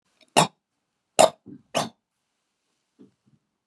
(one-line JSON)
{"three_cough_length": "3.7 s", "three_cough_amplitude": 30828, "three_cough_signal_mean_std_ratio": 0.2, "survey_phase": "beta (2021-08-13 to 2022-03-07)", "age": "65+", "gender": "Male", "wearing_mask": "No", "symptom_none": true, "smoker_status": "Ex-smoker", "respiratory_condition_asthma": false, "respiratory_condition_other": false, "recruitment_source": "REACT", "submission_delay": "1 day", "covid_test_result": "Negative", "covid_test_method": "RT-qPCR"}